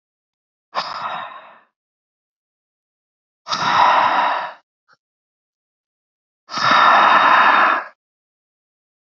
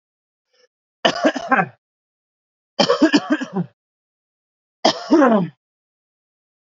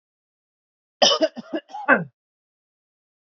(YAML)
exhalation_length: 9.0 s
exhalation_amplitude: 27781
exhalation_signal_mean_std_ratio: 0.44
three_cough_length: 6.7 s
three_cough_amplitude: 32768
three_cough_signal_mean_std_ratio: 0.37
cough_length: 3.2 s
cough_amplitude: 27003
cough_signal_mean_std_ratio: 0.29
survey_phase: beta (2021-08-13 to 2022-03-07)
age: 18-44
gender: Male
wearing_mask: 'No'
symptom_none: true
smoker_status: Never smoked
respiratory_condition_asthma: false
respiratory_condition_other: false
recruitment_source: REACT
submission_delay: 2 days
covid_test_result: Negative
covid_test_method: RT-qPCR